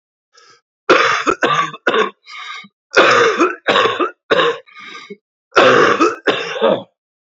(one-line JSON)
{"three_cough_length": "7.3 s", "three_cough_amplitude": 30807, "three_cough_signal_mean_std_ratio": 0.57, "survey_phase": "beta (2021-08-13 to 2022-03-07)", "age": "18-44", "gender": "Male", "wearing_mask": "No", "symptom_cough_any": true, "symptom_runny_or_blocked_nose": true, "symptom_fatigue": true, "smoker_status": "Never smoked", "respiratory_condition_asthma": false, "respiratory_condition_other": false, "recruitment_source": "Test and Trace", "submission_delay": "0 days", "covid_test_result": "Positive", "covid_test_method": "LFT"}